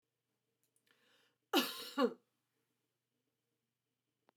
cough_length: 4.4 s
cough_amplitude: 3876
cough_signal_mean_std_ratio: 0.23
survey_phase: beta (2021-08-13 to 2022-03-07)
age: 65+
gender: Female
wearing_mask: 'No'
symptom_change_to_sense_of_smell_or_taste: true
symptom_onset: 12 days
smoker_status: Never smoked
respiratory_condition_asthma: false
respiratory_condition_other: false
recruitment_source: REACT
submission_delay: 2 days
covid_test_result: Negative
covid_test_method: RT-qPCR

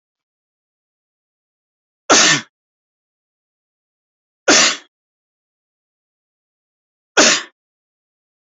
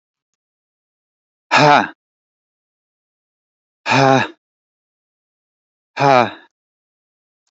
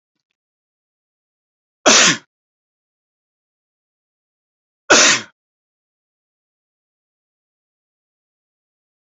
three_cough_length: 8.5 s
three_cough_amplitude: 32768
three_cough_signal_mean_std_ratio: 0.24
exhalation_length: 7.5 s
exhalation_amplitude: 32313
exhalation_signal_mean_std_ratio: 0.28
cough_length: 9.1 s
cough_amplitude: 31778
cough_signal_mean_std_ratio: 0.2
survey_phase: alpha (2021-03-01 to 2021-08-12)
age: 45-64
gender: Male
wearing_mask: 'No'
symptom_none: true
smoker_status: Ex-smoker
respiratory_condition_asthma: false
respiratory_condition_other: false
recruitment_source: REACT
submission_delay: 3 days
covid_test_result: Negative
covid_test_method: RT-qPCR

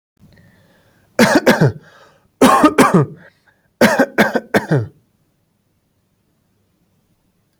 three_cough_length: 7.6 s
three_cough_amplitude: 32768
three_cough_signal_mean_std_ratio: 0.39
survey_phase: alpha (2021-03-01 to 2021-08-12)
age: 18-44
gender: Male
wearing_mask: 'No'
symptom_none: true
smoker_status: Never smoked
respiratory_condition_asthma: false
respiratory_condition_other: false
recruitment_source: REACT
submission_delay: 1 day
covid_test_result: Negative
covid_test_method: RT-qPCR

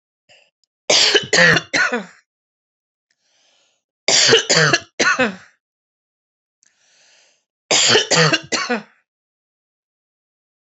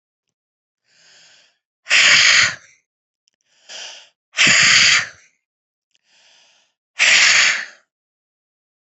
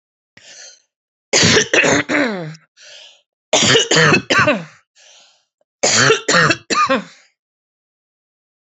three_cough_length: 10.7 s
three_cough_amplitude: 32534
three_cough_signal_mean_std_ratio: 0.4
exhalation_length: 9.0 s
exhalation_amplitude: 32768
exhalation_signal_mean_std_ratio: 0.4
cough_length: 8.7 s
cough_amplitude: 32589
cough_signal_mean_std_ratio: 0.49
survey_phase: alpha (2021-03-01 to 2021-08-12)
age: 45-64
gender: Female
wearing_mask: 'No'
symptom_none: true
smoker_status: Ex-smoker
respiratory_condition_asthma: false
respiratory_condition_other: false
recruitment_source: REACT
submission_delay: 2 days
covid_test_result: Negative
covid_test_method: RT-qPCR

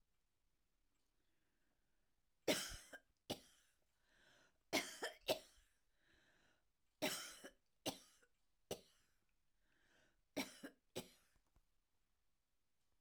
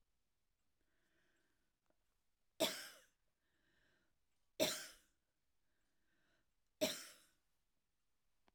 cough_length: 13.0 s
cough_amplitude: 1984
cough_signal_mean_std_ratio: 0.27
three_cough_length: 8.5 s
three_cough_amplitude: 2375
three_cough_signal_mean_std_ratio: 0.22
survey_phase: alpha (2021-03-01 to 2021-08-12)
age: 65+
gender: Female
wearing_mask: 'No'
symptom_fatigue: true
smoker_status: Ex-smoker
respiratory_condition_asthma: false
respiratory_condition_other: false
recruitment_source: REACT
submission_delay: 2 days
covid_test_result: Negative
covid_test_method: RT-qPCR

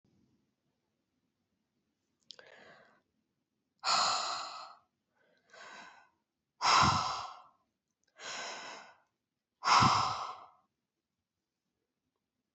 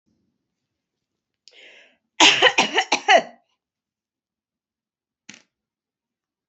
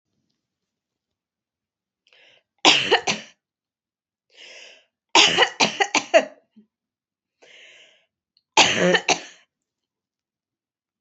exhalation_length: 12.5 s
exhalation_amplitude: 7551
exhalation_signal_mean_std_ratio: 0.32
cough_length: 6.5 s
cough_amplitude: 28660
cough_signal_mean_std_ratio: 0.25
three_cough_length: 11.0 s
three_cough_amplitude: 29675
three_cough_signal_mean_std_ratio: 0.29
survey_phase: beta (2021-08-13 to 2022-03-07)
age: 65+
gender: Female
wearing_mask: 'No'
symptom_none: true
smoker_status: Never smoked
respiratory_condition_asthma: false
respiratory_condition_other: false
recruitment_source: Test and Trace
submission_delay: 1 day
covid_test_method: RT-qPCR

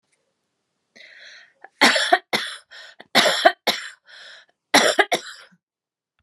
three_cough_length: 6.2 s
three_cough_amplitude: 32651
three_cough_signal_mean_std_ratio: 0.35
survey_phase: beta (2021-08-13 to 2022-03-07)
age: 45-64
gender: Female
wearing_mask: 'No'
symptom_sore_throat: true
smoker_status: Ex-smoker
respiratory_condition_asthma: true
respiratory_condition_other: false
recruitment_source: REACT
submission_delay: 2 days
covid_test_result: Negative
covid_test_method: RT-qPCR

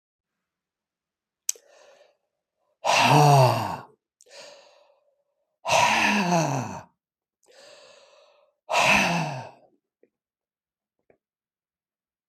exhalation_length: 12.3 s
exhalation_amplitude: 20156
exhalation_signal_mean_std_ratio: 0.37
survey_phase: beta (2021-08-13 to 2022-03-07)
age: 65+
gender: Male
wearing_mask: 'No'
symptom_none: true
smoker_status: Ex-smoker
respiratory_condition_asthma: false
respiratory_condition_other: false
recruitment_source: REACT
submission_delay: 1 day
covid_test_result: Negative
covid_test_method: RT-qPCR
influenza_a_test_result: Negative
influenza_b_test_result: Negative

